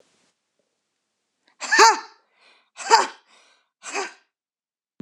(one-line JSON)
{"exhalation_length": "5.0 s", "exhalation_amplitude": 26028, "exhalation_signal_mean_std_ratio": 0.26, "survey_phase": "beta (2021-08-13 to 2022-03-07)", "age": "65+", "gender": "Female", "wearing_mask": "No", "symptom_none": true, "symptom_onset": "12 days", "smoker_status": "Never smoked", "respiratory_condition_asthma": false, "respiratory_condition_other": false, "recruitment_source": "REACT", "submission_delay": "2 days", "covid_test_result": "Negative", "covid_test_method": "RT-qPCR", "influenza_a_test_result": "Negative", "influenza_b_test_result": "Negative"}